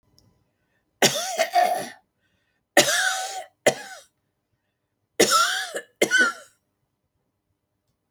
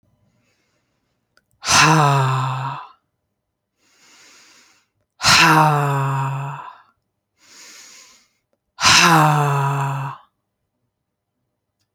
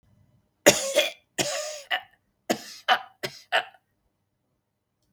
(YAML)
three_cough_length: 8.1 s
three_cough_amplitude: 28559
three_cough_signal_mean_std_ratio: 0.4
exhalation_length: 11.9 s
exhalation_amplitude: 32768
exhalation_signal_mean_std_ratio: 0.46
cough_length: 5.1 s
cough_amplitude: 28577
cough_signal_mean_std_ratio: 0.33
survey_phase: alpha (2021-03-01 to 2021-08-12)
age: 65+
gender: Female
wearing_mask: 'No'
symptom_none: true
smoker_status: Never smoked
respiratory_condition_asthma: false
respiratory_condition_other: false
recruitment_source: REACT
submission_delay: 3 days
covid_test_result: Negative
covid_test_method: RT-qPCR